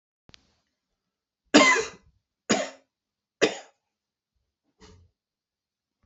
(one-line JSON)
{"three_cough_length": "6.1 s", "three_cough_amplitude": 25574, "three_cough_signal_mean_std_ratio": 0.23, "survey_phase": "beta (2021-08-13 to 2022-03-07)", "age": "45-64", "gender": "Male", "wearing_mask": "No", "symptom_cough_any": true, "symptom_sore_throat": true, "symptom_fatigue": true, "symptom_fever_high_temperature": true, "symptom_headache": true, "symptom_onset": "3 days", "smoker_status": "Never smoked", "respiratory_condition_asthma": false, "respiratory_condition_other": false, "recruitment_source": "Test and Trace", "submission_delay": "2 days", "covid_test_result": "Positive", "covid_test_method": "RT-qPCR", "covid_ct_value": 16.8, "covid_ct_gene": "ORF1ab gene", "covid_ct_mean": 18.0, "covid_viral_load": "1300000 copies/ml", "covid_viral_load_category": "High viral load (>1M copies/ml)"}